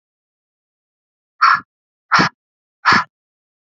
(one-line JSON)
{"exhalation_length": "3.7 s", "exhalation_amplitude": 29877, "exhalation_signal_mean_std_ratio": 0.3, "survey_phase": "beta (2021-08-13 to 2022-03-07)", "age": "18-44", "gender": "Female", "wearing_mask": "No", "symptom_cough_any": true, "symptom_runny_or_blocked_nose": true, "symptom_sore_throat": true, "symptom_fatigue": true, "smoker_status": "Never smoked", "respiratory_condition_asthma": false, "respiratory_condition_other": false, "recruitment_source": "Test and Trace", "submission_delay": "2 days", "covid_test_result": "Positive", "covid_test_method": "LFT"}